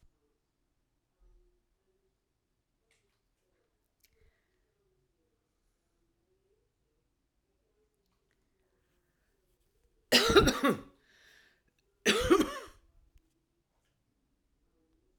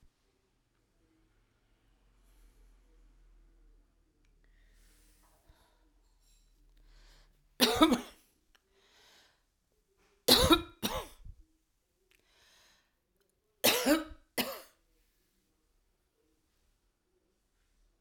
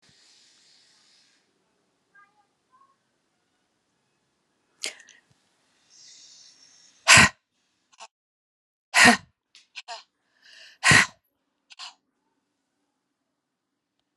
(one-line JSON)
{"cough_length": "15.2 s", "cough_amplitude": 12835, "cough_signal_mean_std_ratio": 0.2, "three_cough_length": "18.0 s", "three_cough_amplitude": 15521, "three_cough_signal_mean_std_ratio": 0.22, "exhalation_length": "14.2 s", "exhalation_amplitude": 31807, "exhalation_signal_mean_std_ratio": 0.18, "survey_phase": "alpha (2021-03-01 to 2021-08-12)", "age": "65+", "gender": "Female", "wearing_mask": "No", "symptom_cough_any": true, "symptom_fatigue": true, "symptom_onset": "12 days", "smoker_status": "Current smoker (1 to 10 cigarettes per day)", "respiratory_condition_asthma": false, "respiratory_condition_other": false, "recruitment_source": "REACT", "submission_delay": "3 days", "covid_test_result": "Negative", "covid_test_method": "RT-qPCR"}